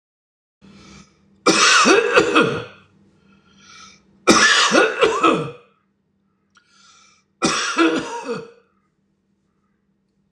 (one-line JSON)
{"three_cough_length": "10.3 s", "three_cough_amplitude": 26028, "three_cough_signal_mean_std_ratio": 0.45, "survey_phase": "alpha (2021-03-01 to 2021-08-12)", "age": "65+", "gender": "Male", "wearing_mask": "No", "symptom_none": true, "smoker_status": "Ex-smoker", "respiratory_condition_asthma": false, "respiratory_condition_other": false, "recruitment_source": "REACT", "submission_delay": "2 days", "covid_test_result": "Negative", "covid_test_method": "RT-qPCR"}